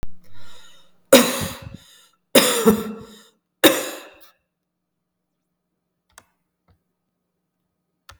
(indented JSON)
{
  "three_cough_length": "8.2 s",
  "three_cough_amplitude": 32768,
  "three_cough_signal_mean_std_ratio": 0.31,
  "survey_phase": "beta (2021-08-13 to 2022-03-07)",
  "age": "45-64",
  "gender": "Female",
  "wearing_mask": "No",
  "symptom_change_to_sense_of_smell_or_taste": true,
  "smoker_status": "Ex-smoker",
  "respiratory_condition_asthma": false,
  "respiratory_condition_other": false,
  "recruitment_source": "Test and Trace",
  "submission_delay": "9 days",
  "covid_test_result": "Negative",
  "covid_test_method": "RT-qPCR"
}